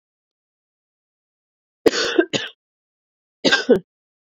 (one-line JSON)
{"cough_length": "4.3 s", "cough_amplitude": 27563, "cough_signal_mean_std_ratio": 0.29, "survey_phase": "beta (2021-08-13 to 2022-03-07)", "age": "18-44", "gender": "Female", "wearing_mask": "No", "symptom_cough_any": true, "symptom_runny_or_blocked_nose": true, "symptom_fatigue": true, "symptom_fever_high_temperature": true, "symptom_headache": true, "symptom_change_to_sense_of_smell_or_taste": true, "symptom_loss_of_taste": true, "symptom_onset": "3 days", "smoker_status": "Ex-smoker", "respiratory_condition_asthma": false, "respiratory_condition_other": false, "recruitment_source": "Test and Trace", "submission_delay": "2 days", "covid_test_result": "Positive", "covid_test_method": "RT-qPCR"}